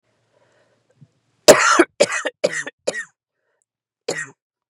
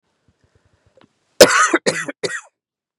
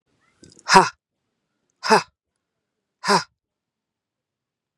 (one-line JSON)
{"three_cough_length": "4.7 s", "three_cough_amplitude": 32768, "three_cough_signal_mean_std_ratio": 0.29, "cough_length": "3.0 s", "cough_amplitude": 32768, "cough_signal_mean_std_ratio": 0.3, "exhalation_length": "4.8 s", "exhalation_amplitude": 32767, "exhalation_signal_mean_std_ratio": 0.23, "survey_phase": "beta (2021-08-13 to 2022-03-07)", "age": "45-64", "gender": "Female", "wearing_mask": "No", "symptom_cough_any": true, "symptom_new_continuous_cough": true, "symptom_runny_or_blocked_nose": true, "symptom_shortness_of_breath": true, "symptom_fatigue": true, "symptom_onset": "12 days", "smoker_status": "Never smoked", "respiratory_condition_asthma": false, "respiratory_condition_other": false, "recruitment_source": "REACT", "submission_delay": "1 day", "covid_test_result": "Negative", "covid_test_method": "RT-qPCR", "influenza_a_test_result": "Negative", "influenza_b_test_result": "Negative"}